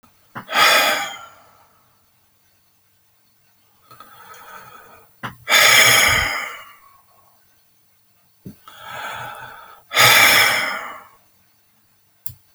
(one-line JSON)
{"exhalation_length": "12.5 s", "exhalation_amplitude": 32768, "exhalation_signal_mean_std_ratio": 0.39, "survey_phase": "alpha (2021-03-01 to 2021-08-12)", "age": "65+", "gender": "Male", "wearing_mask": "No", "symptom_none": true, "smoker_status": "Never smoked", "respiratory_condition_asthma": false, "respiratory_condition_other": false, "recruitment_source": "REACT", "submission_delay": "2 days", "covid_test_result": "Negative", "covid_test_method": "RT-qPCR"}